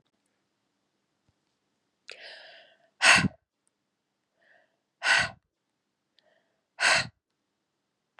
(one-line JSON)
{"exhalation_length": "8.2 s", "exhalation_amplitude": 18457, "exhalation_signal_mean_std_ratio": 0.24, "survey_phase": "beta (2021-08-13 to 2022-03-07)", "age": "18-44", "gender": "Female", "wearing_mask": "No", "symptom_cough_any": true, "symptom_new_continuous_cough": true, "symptom_runny_or_blocked_nose": true, "symptom_onset": "6 days", "smoker_status": "Never smoked", "respiratory_condition_asthma": false, "respiratory_condition_other": false, "recruitment_source": "Test and Trace", "submission_delay": "2 days", "covid_test_result": "Positive", "covid_test_method": "RT-qPCR", "covid_ct_value": 25.2, "covid_ct_gene": "ORF1ab gene", "covid_ct_mean": 25.6, "covid_viral_load": "4000 copies/ml", "covid_viral_load_category": "Minimal viral load (< 10K copies/ml)"}